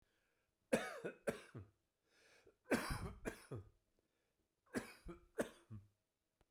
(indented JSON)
{
  "three_cough_length": "6.5 s",
  "three_cough_amplitude": 2855,
  "three_cough_signal_mean_std_ratio": 0.35,
  "survey_phase": "beta (2021-08-13 to 2022-03-07)",
  "age": "45-64",
  "gender": "Male",
  "wearing_mask": "No",
  "symptom_cough_any": true,
  "symptom_shortness_of_breath": true,
  "symptom_fatigue": true,
  "symptom_change_to_sense_of_smell_or_taste": true,
  "symptom_loss_of_taste": true,
  "symptom_onset": "6 days",
  "smoker_status": "Never smoked",
  "respiratory_condition_asthma": false,
  "respiratory_condition_other": false,
  "recruitment_source": "Test and Trace",
  "submission_delay": "2 days",
  "covid_test_result": "Positive",
  "covid_test_method": "RT-qPCR"
}